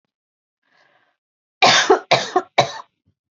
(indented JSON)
{
  "three_cough_length": "3.3 s",
  "three_cough_amplitude": 30053,
  "three_cough_signal_mean_std_ratio": 0.34,
  "survey_phase": "beta (2021-08-13 to 2022-03-07)",
  "age": "18-44",
  "gender": "Female",
  "wearing_mask": "No",
  "symptom_fatigue": true,
  "symptom_headache": true,
  "smoker_status": "Never smoked",
  "respiratory_condition_asthma": false,
  "respiratory_condition_other": false,
  "recruitment_source": "Test and Trace",
  "submission_delay": "2 days",
  "covid_test_result": "Positive",
  "covid_test_method": "ePCR"
}